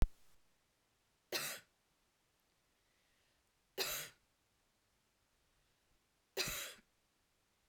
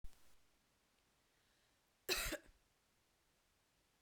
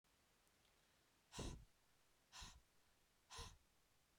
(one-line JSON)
{"three_cough_length": "7.7 s", "three_cough_amplitude": 3746, "three_cough_signal_mean_std_ratio": 0.21, "cough_length": "4.0 s", "cough_amplitude": 2088, "cough_signal_mean_std_ratio": 0.28, "exhalation_length": "4.2 s", "exhalation_amplitude": 340, "exhalation_signal_mean_std_ratio": 0.43, "survey_phase": "beta (2021-08-13 to 2022-03-07)", "age": "18-44", "gender": "Female", "wearing_mask": "No", "symptom_runny_or_blocked_nose": true, "symptom_change_to_sense_of_smell_or_taste": true, "symptom_onset": "2 days", "smoker_status": "Never smoked", "respiratory_condition_asthma": false, "respiratory_condition_other": false, "recruitment_source": "Test and Trace", "submission_delay": "2 days", "covid_test_result": "Positive", "covid_test_method": "RT-qPCR"}